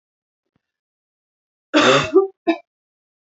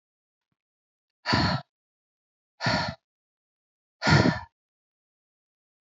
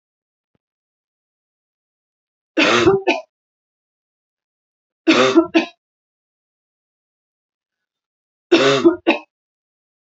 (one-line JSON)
{"cough_length": "3.2 s", "cough_amplitude": 27149, "cough_signal_mean_std_ratio": 0.33, "exhalation_length": "5.8 s", "exhalation_amplitude": 13554, "exhalation_signal_mean_std_ratio": 0.31, "three_cough_length": "10.1 s", "three_cough_amplitude": 29873, "three_cough_signal_mean_std_ratio": 0.31, "survey_phase": "beta (2021-08-13 to 2022-03-07)", "age": "18-44", "gender": "Female", "wearing_mask": "No", "symptom_cough_any": true, "symptom_runny_or_blocked_nose": true, "symptom_fatigue": true, "symptom_headache": true, "symptom_onset": "4 days", "smoker_status": "Never smoked", "respiratory_condition_asthma": false, "respiratory_condition_other": false, "recruitment_source": "Test and Trace", "submission_delay": "2 days", "covid_test_result": "Positive", "covid_test_method": "ePCR"}